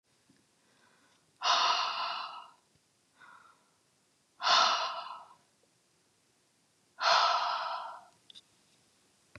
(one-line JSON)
{"exhalation_length": "9.4 s", "exhalation_amplitude": 8925, "exhalation_signal_mean_std_ratio": 0.4, "survey_phase": "beta (2021-08-13 to 2022-03-07)", "age": "45-64", "gender": "Female", "wearing_mask": "No", "symptom_cough_any": true, "symptom_fatigue": true, "smoker_status": "Never smoked", "respiratory_condition_asthma": false, "respiratory_condition_other": false, "recruitment_source": "REACT", "submission_delay": "6 days", "covid_test_result": "Negative", "covid_test_method": "RT-qPCR", "influenza_a_test_result": "Negative", "influenza_b_test_result": "Negative"}